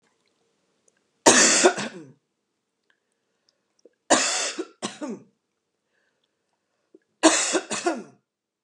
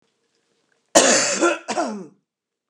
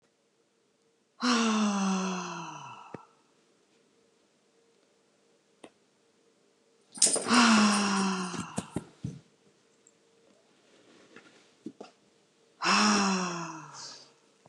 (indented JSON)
{
  "three_cough_length": "8.6 s",
  "three_cough_amplitude": 29203,
  "three_cough_signal_mean_std_ratio": 0.33,
  "cough_length": "2.7 s",
  "cough_amplitude": 29204,
  "cough_signal_mean_std_ratio": 0.43,
  "exhalation_length": "14.5 s",
  "exhalation_amplitude": 18063,
  "exhalation_signal_mean_std_ratio": 0.42,
  "survey_phase": "beta (2021-08-13 to 2022-03-07)",
  "age": "45-64",
  "gender": "Female",
  "wearing_mask": "No",
  "symptom_none": true,
  "smoker_status": "Ex-smoker",
  "respiratory_condition_asthma": false,
  "respiratory_condition_other": false,
  "recruitment_source": "REACT",
  "submission_delay": "0 days",
  "covid_test_result": "Negative",
  "covid_test_method": "RT-qPCR",
  "influenza_a_test_result": "Unknown/Void",
  "influenza_b_test_result": "Unknown/Void"
}